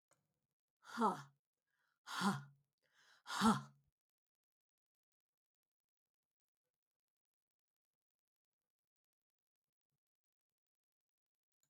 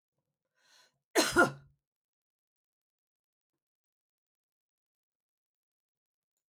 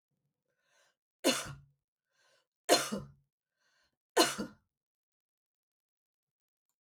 {
  "exhalation_length": "11.7 s",
  "exhalation_amplitude": 2894,
  "exhalation_signal_mean_std_ratio": 0.2,
  "cough_length": "6.5 s",
  "cough_amplitude": 8560,
  "cough_signal_mean_std_ratio": 0.16,
  "three_cough_length": "6.8 s",
  "three_cough_amplitude": 8717,
  "three_cough_signal_mean_std_ratio": 0.23,
  "survey_phase": "alpha (2021-03-01 to 2021-08-12)",
  "age": "65+",
  "gender": "Female",
  "wearing_mask": "No",
  "symptom_none": true,
  "smoker_status": "Ex-smoker",
  "respiratory_condition_asthma": false,
  "respiratory_condition_other": false,
  "recruitment_source": "REACT",
  "submission_delay": "5 days",
  "covid_test_result": "Negative",
  "covid_test_method": "RT-qPCR"
}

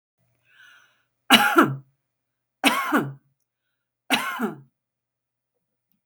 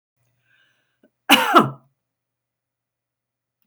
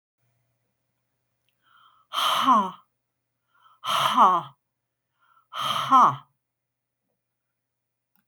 {
  "three_cough_length": "6.1 s",
  "three_cough_amplitude": 30539,
  "three_cough_signal_mean_std_ratio": 0.32,
  "cough_length": "3.7 s",
  "cough_amplitude": 30130,
  "cough_signal_mean_std_ratio": 0.23,
  "exhalation_length": "8.3 s",
  "exhalation_amplitude": 18442,
  "exhalation_signal_mean_std_ratio": 0.34,
  "survey_phase": "beta (2021-08-13 to 2022-03-07)",
  "age": "65+",
  "gender": "Female",
  "wearing_mask": "No",
  "symptom_none": true,
  "smoker_status": "Never smoked",
  "respiratory_condition_asthma": false,
  "respiratory_condition_other": false,
  "recruitment_source": "REACT",
  "submission_delay": "3 days",
  "covid_test_result": "Negative",
  "covid_test_method": "RT-qPCR",
  "influenza_a_test_result": "Negative",
  "influenza_b_test_result": "Negative"
}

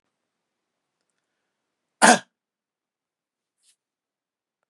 {
  "cough_length": "4.7 s",
  "cough_amplitude": 32697,
  "cough_signal_mean_std_ratio": 0.14,
  "survey_phase": "beta (2021-08-13 to 2022-03-07)",
  "age": "45-64",
  "gender": "Male",
  "wearing_mask": "No",
  "symptom_none": true,
  "smoker_status": "Ex-smoker",
  "respiratory_condition_asthma": false,
  "respiratory_condition_other": false,
  "recruitment_source": "REACT",
  "submission_delay": "3 days",
  "covid_test_result": "Negative",
  "covid_test_method": "RT-qPCR",
  "influenza_a_test_result": "Negative",
  "influenza_b_test_result": "Negative"
}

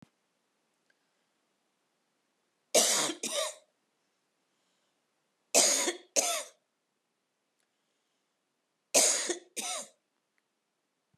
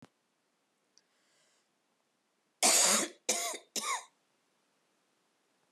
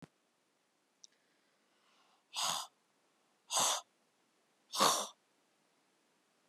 {
  "three_cough_length": "11.2 s",
  "three_cough_amplitude": 14160,
  "three_cough_signal_mean_std_ratio": 0.31,
  "cough_length": "5.7 s",
  "cough_amplitude": 7539,
  "cough_signal_mean_std_ratio": 0.31,
  "exhalation_length": "6.5 s",
  "exhalation_amplitude": 5726,
  "exhalation_signal_mean_std_ratio": 0.29,
  "survey_phase": "beta (2021-08-13 to 2022-03-07)",
  "age": "65+",
  "gender": "Female",
  "wearing_mask": "No",
  "symptom_cough_any": true,
  "symptom_runny_or_blocked_nose": true,
  "symptom_sore_throat": true,
  "symptom_fatigue": true,
  "symptom_headache": true,
  "symptom_onset": "4 days",
  "smoker_status": "Never smoked",
  "respiratory_condition_asthma": false,
  "respiratory_condition_other": false,
  "recruitment_source": "Test and Trace",
  "submission_delay": "2 days",
  "covid_test_result": "Positive",
  "covid_test_method": "ePCR"
}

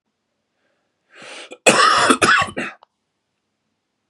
{
  "cough_length": "4.1 s",
  "cough_amplitude": 32768,
  "cough_signal_mean_std_ratio": 0.38,
  "survey_phase": "beta (2021-08-13 to 2022-03-07)",
  "age": "45-64",
  "gender": "Male",
  "wearing_mask": "No",
  "symptom_cough_any": true,
  "symptom_runny_or_blocked_nose": true,
  "symptom_fever_high_temperature": true,
  "symptom_headache": true,
  "smoker_status": "Never smoked",
  "respiratory_condition_asthma": true,
  "respiratory_condition_other": false,
  "recruitment_source": "Test and Trace",
  "submission_delay": "2 days",
  "covid_test_result": "Positive",
  "covid_test_method": "LFT"
}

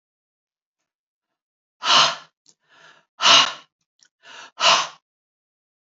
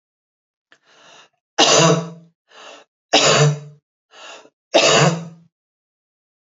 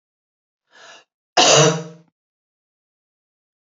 {
  "exhalation_length": "5.8 s",
  "exhalation_amplitude": 28892,
  "exhalation_signal_mean_std_ratio": 0.3,
  "three_cough_length": "6.5 s",
  "three_cough_amplitude": 32145,
  "three_cough_signal_mean_std_ratio": 0.4,
  "cough_length": "3.7 s",
  "cough_amplitude": 29286,
  "cough_signal_mean_std_ratio": 0.28,
  "survey_phase": "alpha (2021-03-01 to 2021-08-12)",
  "age": "65+",
  "gender": "Female",
  "wearing_mask": "No",
  "symptom_none": true,
  "smoker_status": "Never smoked",
  "respiratory_condition_asthma": false,
  "respiratory_condition_other": false,
  "recruitment_source": "REACT",
  "submission_delay": "3 days",
  "covid_test_result": "Negative",
  "covid_test_method": "RT-qPCR"
}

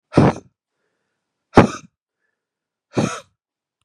{
  "exhalation_length": "3.8 s",
  "exhalation_amplitude": 32768,
  "exhalation_signal_mean_std_ratio": 0.25,
  "survey_phase": "beta (2021-08-13 to 2022-03-07)",
  "age": "45-64",
  "gender": "Male",
  "wearing_mask": "No",
  "symptom_cough_any": true,
  "symptom_new_continuous_cough": true,
  "symptom_runny_or_blocked_nose": true,
  "symptom_shortness_of_breath": true,
  "symptom_fever_high_temperature": true,
  "symptom_headache": true,
  "symptom_change_to_sense_of_smell_or_taste": true,
  "smoker_status": "Never smoked",
  "respiratory_condition_asthma": false,
  "respiratory_condition_other": false,
  "recruitment_source": "Test and Trace",
  "submission_delay": "2 days",
  "covid_test_result": "Positive",
  "covid_test_method": "RT-qPCR"
}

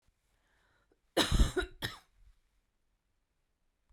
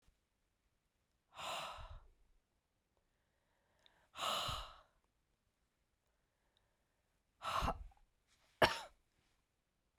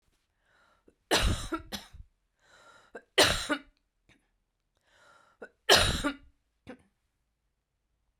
{
  "cough_length": "3.9 s",
  "cough_amplitude": 7010,
  "cough_signal_mean_std_ratio": 0.27,
  "exhalation_length": "10.0 s",
  "exhalation_amplitude": 5561,
  "exhalation_signal_mean_std_ratio": 0.27,
  "three_cough_length": "8.2 s",
  "three_cough_amplitude": 16500,
  "three_cough_signal_mean_std_ratio": 0.29,
  "survey_phase": "beta (2021-08-13 to 2022-03-07)",
  "age": "65+",
  "gender": "Female",
  "wearing_mask": "No",
  "symptom_cough_any": true,
  "symptom_runny_or_blocked_nose": true,
  "symptom_fatigue": true,
  "symptom_change_to_sense_of_smell_or_taste": true,
  "symptom_onset": "6 days",
  "smoker_status": "Never smoked",
  "respiratory_condition_asthma": false,
  "respiratory_condition_other": false,
  "recruitment_source": "Test and Trace",
  "submission_delay": "2 days",
  "covid_test_result": "Positive",
  "covid_test_method": "RT-qPCR",
  "covid_ct_value": 18.2,
  "covid_ct_gene": "ORF1ab gene",
  "covid_ct_mean": 18.7,
  "covid_viral_load": "710000 copies/ml",
  "covid_viral_load_category": "Low viral load (10K-1M copies/ml)"
}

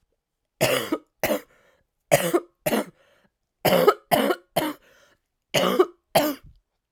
{
  "three_cough_length": "6.9 s",
  "three_cough_amplitude": 23563,
  "three_cough_signal_mean_std_ratio": 0.43,
  "survey_phase": "alpha (2021-03-01 to 2021-08-12)",
  "age": "18-44",
  "gender": "Female",
  "wearing_mask": "No",
  "symptom_cough_any": true,
  "symptom_new_continuous_cough": true,
  "symptom_shortness_of_breath": true,
  "symptom_fatigue": true,
  "symptom_fever_high_temperature": true,
  "symptom_headache": true,
  "symptom_change_to_sense_of_smell_or_taste": true,
  "symptom_loss_of_taste": true,
  "symptom_onset": "5 days",
  "smoker_status": "Never smoked",
  "respiratory_condition_asthma": false,
  "respiratory_condition_other": false,
  "recruitment_source": "Test and Trace",
  "submission_delay": "2 days",
  "covid_test_result": "Positive",
  "covid_test_method": "RT-qPCR",
  "covid_ct_value": 10.9,
  "covid_ct_gene": "N gene",
  "covid_ct_mean": 11.5,
  "covid_viral_load": "170000000 copies/ml",
  "covid_viral_load_category": "High viral load (>1M copies/ml)"
}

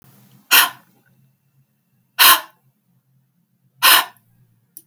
{
  "exhalation_length": "4.9 s",
  "exhalation_amplitude": 32768,
  "exhalation_signal_mean_std_ratio": 0.28,
  "survey_phase": "beta (2021-08-13 to 2022-03-07)",
  "age": "45-64",
  "gender": "Female",
  "wearing_mask": "No",
  "symptom_none": true,
  "symptom_onset": "4 days",
  "smoker_status": "Never smoked",
  "respiratory_condition_asthma": false,
  "respiratory_condition_other": false,
  "recruitment_source": "REACT",
  "submission_delay": "2 days",
  "covid_test_result": "Negative",
  "covid_test_method": "RT-qPCR"
}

